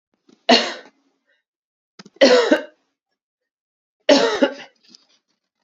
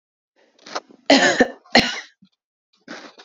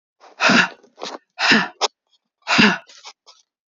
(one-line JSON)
{"three_cough_length": "5.6 s", "three_cough_amplitude": 29853, "three_cough_signal_mean_std_ratio": 0.33, "cough_length": "3.2 s", "cough_amplitude": 29328, "cough_signal_mean_std_ratio": 0.34, "exhalation_length": "3.8 s", "exhalation_amplitude": 30577, "exhalation_signal_mean_std_ratio": 0.41, "survey_phase": "beta (2021-08-13 to 2022-03-07)", "age": "45-64", "gender": "Female", "wearing_mask": "No", "symptom_cough_any": true, "symptom_runny_or_blocked_nose": true, "symptom_sore_throat": true, "symptom_fatigue": true, "symptom_headache": true, "symptom_change_to_sense_of_smell_or_taste": true, "smoker_status": "Ex-smoker", "respiratory_condition_asthma": false, "respiratory_condition_other": false, "recruitment_source": "Test and Trace", "submission_delay": "2 days", "covid_test_result": "Positive", "covid_test_method": "RT-qPCR", "covid_ct_value": 23.3, "covid_ct_gene": "ORF1ab gene"}